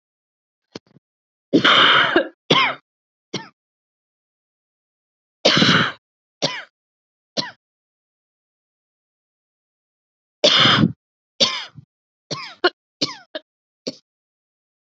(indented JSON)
{
  "three_cough_length": "14.9 s",
  "three_cough_amplitude": 32768,
  "three_cough_signal_mean_std_ratio": 0.32,
  "survey_phase": "beta (2021-08-13 to 2022-03-07)",
  "age": "18-44",
  "gender": "Female",
  "wearing_mask": "No",
  "symptom_new_continuous_cough": true,
  "symptom_sore_throat": true,
  "symptom_diarrhoea": true,
  "symptom_fatigue": true,
  "symptom_other": true,
  "smoker_status": "Never smoked",
  "respiratory_condition_asthma": false,
  "respiratory_condition_other": false,
  "recruitment_source": "Test and Trace",
  "submission_delay": "2 days",
  "covid_test_result": "Positive",
  "covid_test_method": "RT-qPCR",
  "covid_ct_value": 30.3,
  "covid_ct_gene": "N gene"
}